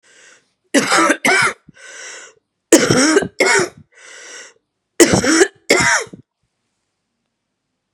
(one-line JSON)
{"three_cough_length": "7.9 s", "three_cough_amplitude": 32768, "three_cough_signal_mean_std_ratio": 0.45, "survey_phase": "beta (2021-08-13 to 2022-03-07)", "age": "18-44", "gender": "Female", "wearing_mask": "No", "symptom_cough_any": true, "symptom_shortness_of_breath": true, "symptom_abdominal_pain": true, "symptom_diarrhoea": true, "symptom_fatigue": true, "symptom_fever_high_temperature": true, "symptom_onset": "3 days", "smoker_status": "Never smoked", "respiratory_condition_asthma": true, "respiratory_condition_other": false, "recruitment_source": "Test and Trace", "submission_delay": "2 days", "covid_test_result": "Positive", "covid_test_method": "RT-qPCR", "covid_ct_value": 17.4, "covid_ct_gene": "ORF1ab gene", "covid_ct_mean": 17.7, "covid_viral_load": "1500000 copies/ml", "covid_viral_load_category": "High viral load (>1M copies/ml)"}